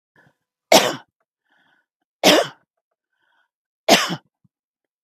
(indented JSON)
{
  "three_cough_length": "5.0 s",
  "three_cough_amplitude": 32768,
  "three_cough_signal_mean_std_ratio": 0.27,
  "survey_phase": "beta (2021-08-13 to 2022-03-07)",
  "age": "45-64",
  "gender": "Female",
  "wearing_mask": "No",
  "symptom_none": true,
  "smoker_status": "Never smoked",
  "respiratory_condition_asthma": false,
  "respiratory_condition_other": false,
  "recruitment_source": "REACT",
  "submission_delay": "1 day",
  "covid_test_result": "Negative",
  "covid_test_method": "RT-qPCR",
  "influenza_a_test_result": "Negative",
  "influenza_b_test_result": "Negative"
}